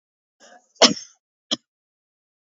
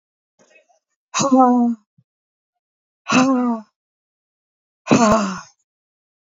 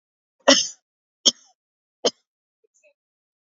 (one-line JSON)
{"cough_length": "2.5 s", "cough_amplitude": 29972, "cough_signal_mean_std_ratio": 0.18, "exhalation_length": "6.2 s", "exhalation_amplitude": 28093, "exhalation_signal_mean_std_ratio": 0.41, "three_cough_length": "3.4 s", "three_cough_amplitude": 32768, "three_cough_signal_mean_std_ratio": 0.2, "survey_phase": "beta (2021-08-13 to 2022-03-07)", "age": "65+", "gender": "Female", "wearing_mask": "No", "symptom_none": true, "smoker_status": "Ex-smoker", "respiratory_condition_asthma": false, "respiratory_condition_other": false, "recruitment_source": "REACT", "submission_delay": "1 day", "covid_test_result": "Negative", "covid_test_method": "RT-qPCR", "influenza_a_test_result": "Unknown/Void", "influenza_b_test_result": "Unknown/Void"}